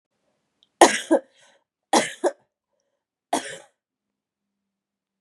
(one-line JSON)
{"three_cough_length": "5.2 s", "three_cough_amplitude": 32767, "three_cough_signal_mean_std_ratio": 0.23, "survey_phase": "beta (2021-08-13 to 2022-03-07)", "age": "18-44", "gender": "Female", "wearing_mask": "No", "symptom_cough_any": true, "symptom_runny_or_blocked_nose": true, "symptom_headache": true, "symptom_onset": "3 days", "smoker_status": "Never smoked", "respiratory_condition_asthma": false, "respiratory_condition_other": false, "recruitment_source": "REACT", "submission_delay": "1 day", "covid_test_result": "Positive", "covid_test_method": "RT-qPCR", "covid_ct_value": 27.0, "covid_ct_gene": "E gene", "influenza_a_test_result": "Negative", "influenza_b_test_result": "Negative"}